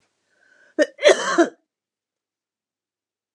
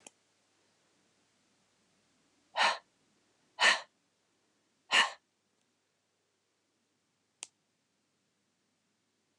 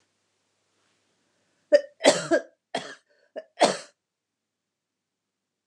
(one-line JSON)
{"cough_length": "3.3 s", "cough_amplitude": 29659, "cough_signal_mean_std_ratio": 0.27, "exhalation_length": "9.4 s", "exhalation_amplitude": 7897, "exhalation_signal_mean_std_ratio": 0.19, "three_cough_length": "5.7 s", "three_cough_amplitude": 22895, "three_cough_signal_mean_std_ratio": 0.24, "survey_phase": "alpha (2021-03-01 to 2021-08-12)", "age": "65+", "gender": "Female", "wearing_mask": "No", "symptom_none": true, "smoker_status": "Never smoked", "respiratory_condition_asthma": false, "respiratory_condition_other": false, "recruitment_source": "REACT", "submission_delay": "1 day", "covid_test_result": "Negative", "covid_test_method": "RT-qPCR"}